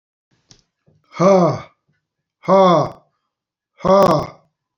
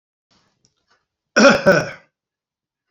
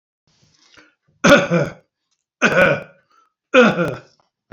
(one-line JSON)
{"exhalation_length": "4.8 s", "exhalation_amplitude": 27846, "exhalation_signal_mean_std_ratio": 0.41, "cough_length": "2.9 s", "cough_amplitude": 31796, "cough_signal_mean_std_ratio": 0.31, "three_cough_length": "4.5 s", "three_cough_amplitude": 32767, "three_cough_signal_mean_std_ratio": 0.39, "survey_phase": "beta (2021-08-13 to 2022-03-07)", "age": "65+", "gender": "Male", "wearing_mask": "No", "symptom_none": true, "smoker_status": "Ex-smoker", "respiratory_condition_asthma": false, "respiratory_condition_other": false, "recruitment_source": "REACT", "submission_delay": "5 days", "covid_test_result": "Negative", "covid_test_method": "RT-qPCR"}